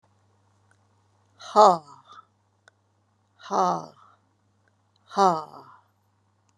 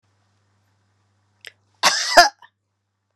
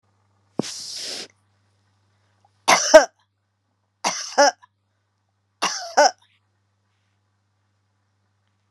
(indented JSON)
{
  "exhalation_length": "6.6 s",
  "exhalation_amplitude": 24387,
  "exhalation_signal_mean_std_ratio": 0.23,
  "cough_length": "3.2 s",
  "cough_amplitude": 32768,
  "cough_signal_mean_std_ratio": 0.24,
  "three_cough_length": "8.7 s",
  "three_cough_amplitude": 32768,
  "three_cough_signal_mean_std_ratio": 0.24,
  "survey_phase": "beta (2021-08-13 to 2022-03-07)",
  "age": "45-64",
  "gender": "Female",
  "wearing_mask": "No",
  "symptom_none": true,
  "smoker_status": "Never smoked",
  "respiratory_condition_asthma": false,
  "respiratory_condition_other": true,
  "recruitment_source": "REACT",
  "submission_delay": "7 days",
  "covid_test_result": "Negative",
  "covid_test_method": "RT-qPCR",
  "influenza_a_test_result": "Negative",
  "influenza_b_test_result": "Negative"
}